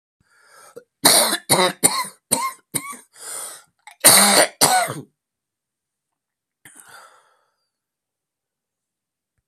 cough_length: 9.5 s
cough_amplitude: 32768
cough_signal_mean_std_ratio: 0.33
survey_phase: beta (2021-08-13 to 2022-03-07)
age: 65+
gender: Male
wearing_mask: 'No'
symptom_new_continuous_cough: true
symptom_runny_or_blocked_nose: true
symptom_shortness_of_breath: true
symptom_sore_throat: true
symptom_fatigue: true
symptom_fever_high_temperature: true
symptom_headache: true
symptom_change_to_sense_of_smell_or_taste: true
symptom_loss_of_taste: true
symptom_onset: 4 days
smoker_status: Never smoked
respiratory_condition_asthma: false
respiratory_condition_other: false
recruitment_source: Test and Trace
submission_delay: 2 days
covid_test_result: Positive
covid_test_method: RT-qPCR
covid_ct_value: 15.8
covid_ct_gene: N gene
covid_ct_mean: 16.9
covid_viral_load: 2800000 copies/ml
covid_viral_load_category: High viral load (>1M copies/ml)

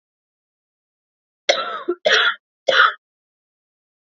three_cough_length: 4.0 s
three_cough_amplitude: 28574
three_cough_signal_mean_std_ratio: 0.35
survey_phase: beta (2021-08-13 to 2022-03-07)
age: 18-44
gender: Female
wearing_mask: 'No'
symptom_cough_any: true
symptom_runny_or_blocked_nose: true
symptom_fatigue: true
symptom_headache: true
symptom_other: true
symptom_onset: 7 days
smoker_status: Never smoked
respiratory_condition_asthma: true
respiratory_condition_other: false
recruitment_source: Test and Trace
submission_delay: 2 days
covid_test_result: Positive
covid_test_method: RT-qPCR
covid_ct_value: 27.3
covid_ct_gene: N gene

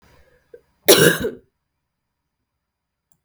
cough_length: 3.2 s
cough_amplitude: 32768
cough_signal_mean_std_ratio: 0.25
survey_phase: beta (2021-08-13 to 2022-03-07)
age: 18-44
gender: Female
wearing_mask: 'No'
symptom_cough_any: true
symptom_new_continuous_cough: true
symptom_fatigue: true
symptom_fever_high_temperature: true
symptom_headache: true
symptom_change_to_sense_of_smell_or_taste: true
symptom_onset: 9 days
smoker_status: Never smoked
respiratory_condition_asthma: false
respiratory_condition_other: false
recruitment_source: Test and Trace
submission_delay: 1 day
covid_test_result: Positive
covid_test_method: RT-qPCR
covid_ct_value: 11.4
covid_ct_gene: ORF1ab gene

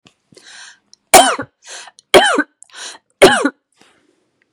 three_cough_length: 4.5 s
three_cough_amplitude: 32768
three_cough_signal_mean_std_ratio: 0.33
survey_phase: beta (2021-08-13 to 2022-03-07)
age: 45-64
gender: Female
wearing_mask: 'No'
symptom_none: true
smoker_status: Never smoked
respiratory_condition_asthma: false
respiratory_condition_other: false
recruitment_source: REACT
submission_delay: 1 day
covid_test_result: Negative
covid_test_method: RT-qPCR
influenza_a_test_result: Negative
influenza_b_test_result: Negative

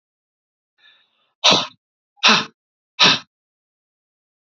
exhalation_length: 4.5 s
exhalation_amplitude: 31115
exhalation_signal_mean_std_ratio: 0.28
survey_phase: beta (2021-08-13 to 2022-03-07)
age: 45-64
gender: Male
wearing_mask: 'No'
symptom_cough_any: true
symptom_runny_or_blocked_nose: true
symptom_sore_throat: true
symptom_fatigue: true
symptom_fever_high_temperature: true
symptom_headache: true
symptom_onset: 5 days
smoker_status: Ex-smoker
respiratory_condition_asthma: true
respiratory_condition_other: false
recruitment_source: Test and Trace
submission_delay: 2 days
covid_test_result: Negative
covid_test_method: RT-qPCR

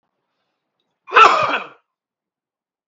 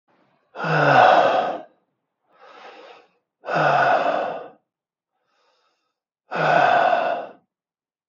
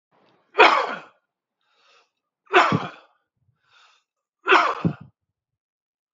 cough_length: 2.9 s
cough_amplitude: 32768
cough_signal_mean_std_ratio: 0.29
exhalation_length: 8.1 s
exhalation_amplitude: 28364
exhalation_signal_mean_std_ratio: 0.49
three_cough_length: 6.1 s
three_cough_amplitude: 32768
three_cough_signal_mean_std_ratio: 0.3
survey_phase: beta (2021-08-13 to 2022-03-07)
age: 45-64
gender: Male
wearing_mask: 'No'
symptom_none: true
smoker_status: Never smoked
respiratory_condition_asthma: false
respiratory_condition_other: false
recruitment_source: REACT
submission_delay: 2 days
covid_test_result: Negative
covid_test_method: RT-qPCR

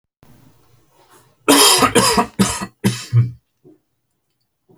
cough_length: 4.8 s
cough_amplitude: 32768
cough_signal_mean_std_ratio: 0.42
survey_phase: alpha (2021-03-01 to 2021-08-12)
age: 45-64
gender: Male
wearing_mask: 'No'
symptom_none: true
smoker_status: Never smoked
respiratory_condition_asthma: false
respiratory_condition_other: false
recruitment_source: REACT
submission_delay: 1 day
covid_test_result: Negative
covid_test_method: RT-qPCR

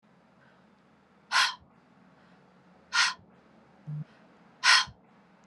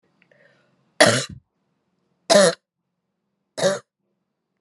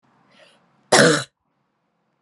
exhalation_length: 5.5 s
exhalation_amplitude: 15997
exhalation_signal_mean_std_ratio: 0.3
three_cough_length: 4.6 s
three_cough_amplitude: 31576
three_cough_signal_mean_std_ratio: 0.29
cough_length: 2.2 s
cough_amplitude: 32768
cough_signal_mean_std_ratio: 0.29
survey_phase: alpha (2021-03-01 to 2021-08-12)
age: 18-44
gender: Female
wearing_mask: 'No'
symptom_loss_of_taste: true
symptom_onset: 4 days
smoker_status: Ex-smoker
respiratory_condition_asthma: false
respiratory_condition_other: false
recruitment_source: Test and Trace
submission_delay: 2 days
covid_test_result: Positive
covid_test_method: RT-qPCR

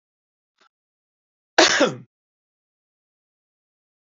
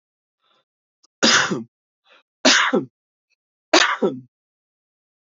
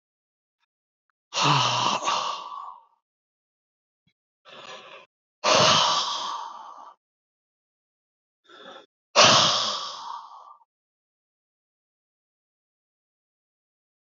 cough_length: 4.2 s
cough_amplitude: 29612
cough_signal_mean_std_ratio: 0.21
three_cough_length: 5.3 s
three_cough_amplitude: 29629
three_cough_signal_mean_std_ratio: 0.35
exhalation_length: 14.2 s
exhalation_amplitude: 24142
exhalation_signal_mean_std_ratio: 0.35
survey_phase: beta (2021-08-13 to 2022-03-07)
age: 45-64
gender: Male
wearing_mask: 'No'
symptom_cough_any: true
symptom_shortness_of_breath: true
symptom_onset: 10 days
smoker_status: Never smoked
respiratory_condition_asthma: true
respiratory_condition_other: false
recruitment_source: REACT
submission_delay: 1 day
covid_test_result: Negative
covid_test_method: RT-qPCR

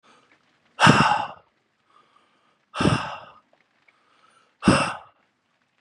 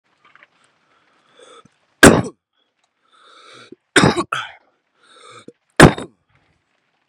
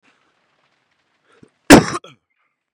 exhalation_length: 5.8 s
exhalation_amplitude: 27619
exhalation_signal_mean_std_ratio: 0.32
three_cough_length: 7.1 s
three_cough_amplitude: 32768
three_cough_signal_mean_std_ratio: 0.22
cough_length: 2.7 s
cough_amplitude: 32768
cough_signal_mean_std_ratio: 0.2
survey_phase: beta (2021-08-13 to 2022-03-07)
age: 18-44
gender: Male
wearing_mask: 'No'
symptom_none: true
smoker_status: Current smoker (1 to 10 cigarettes per day)
respiratory_condition_asthma: false
respiratory_condition_other: false
recruitment_source: REACT
submission_delay: 1 day
covid_test_result: Negative
covid_test_method: RT-qPCR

